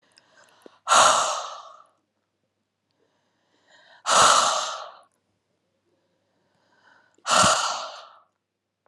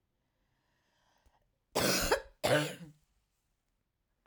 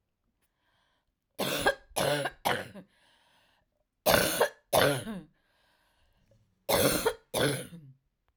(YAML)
exhalation_length: 8.9 s
exhalation_amplitude: 24689
exhalation_signal_mean_std_ratio: 0.35
cough_length: 4.3 s
cough_amplitude: 6904
cough_signal_mean_std_ratio: 0.34
three_cough_length: 8.4 s
three_cough_amplitude: 16523
three_cough_signal_mean_std_ratio: 0.43
survey_phase: alpha (2021-03-01 to 2021-08-12)
age: 45-64
gender: Female
wearing_mask: 'No'
symptom_none: true
smoker_status: Ex-smoker
respiratory_condition_asthma: false
respiratory_condition_other: false
recruitment_source: REACT
submission_delay: 8 days
covid_test_result: Negative
covid_test_method: RT-qPCR